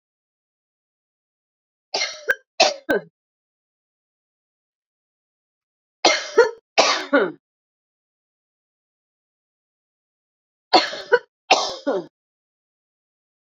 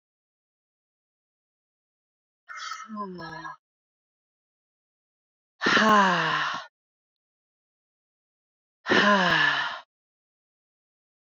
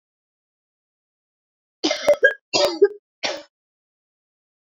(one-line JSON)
{"three_cough_length": "13.5 s", "three_cough_amplitude": 32768, "three_cough_signal_mean_std_ratio": 0.27, "exhalation_length": "11.3 s", "exhalation_amplitude": 14270, "exhalation_signal_mean_std_ratio": 0.35, "cough_length": "4.8 s", "cough_amplitude": 26491, "cough_signal_mean_std_ratio": 0.29, "survey_phase": "beta (2021-08-13 to 2022-03-07)", "age": "45-64", "gender": "Female", "wearing_mask": "No", "symptom_cough_any": true, "symptom_shortness_of_breath": true, "symptom_fatigue": true, "symptom_headache": true, "smoker_status": "Ex-smoker", "respiratory_condition_asthma": false, "respiratory_condition_other": false, "recruitment_source": "Test and Trace", "submission_delay": "1 day", "covid_test_result": "Positive", "covid_test_method": "RT-qPCR"}